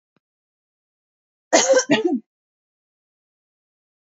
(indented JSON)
{
  "cough_length": "4.2 s",
  "cough_amplitude": 28567,
  "cough_signal_mean_std_ratio": 0.29,
  "survey_phase": "beta (2021-08-13 to 2022-03-07)",
  "age": "18-44",
  "gender": "Female",
  "wearing_mask": "No",
  "symptom_none": true,
  "smoker_status": "Never smoked",
  "respiratory_condition_asthma": false,
  "respiratory_condition_other": false,
  "recruitment_source": "REACT",
  "submission_delay": "1 day",
  "covid_test_result": "Negative",
  "covid_test_method": "RT-qPCR"
}